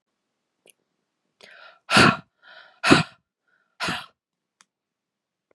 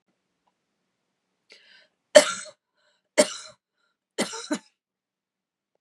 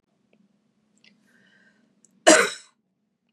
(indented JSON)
{
  "exhalation_length": "5.5 s",
  "exhalation_amplitude": 30232,
  "exhalation_signal_mean_std_ratio": 0.24,
  "three_cough_length": "5.8 s",
  "three_cough_amplitude": 32617,
  "three_cough_signal_mean_std_ratio": 0.18,
  "cough_length": "3.3 s",
  "cough_amplitude": 28511,
  "cough_signal_mean_std_ratio": 0.2,
  "survey_phase": "beta (2021-08-13 to 2022-03-07)",
  "age": "18-44",
  "gender": "Female",
  "wearing_mask": "No",
  "symptom_runny_or_blocked_nose": true,
  "smoker_status": "Never smoked",
  "respiratory_condition_asthma": false,
  "respiratory_condition_other": false,
  "recruitment_source": "Test and Trace",
  "submission_delay": "1 day",
  "covid_test_result": "Positive",
  "covid_test_method": "RT-qPCR",
  "covid_ct_value": 22.6,
  "covid_ct_gene": "N gene"
}